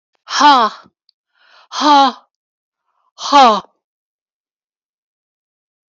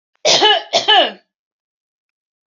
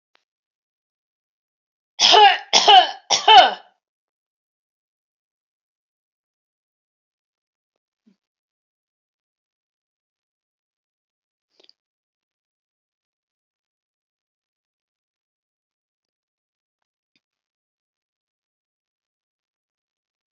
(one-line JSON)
{"exhalation_length": "5.9 s", "exhalation_amplitude": 32768, "exhalation_signal_mean_std_ratio": 0.35, "cough_length": "2.5 s", "cough_amplitude": 32768, "cough_signal_mean_std_ratio": 0.44, "three_cough_length": "20.4 s", "three_cough_amplitude": 32768, "three_cough_signal_mean_std_ratio": 0.17, "survey_phase": "alpha (2021-03-01 to 2021-08-12)", "age": "45-64", "gender": "Female", "wearing_mask": "No", "symptom_none": true, "smoker_status": "Never smoked", "respiratory_condition_asthma": false, "respiratory_condition_other": false, "recruitment_source": "REACT", "submission_delay": "32 days", "covid_test_result": "Negative", "covid_test_method": "RT-qPCR"}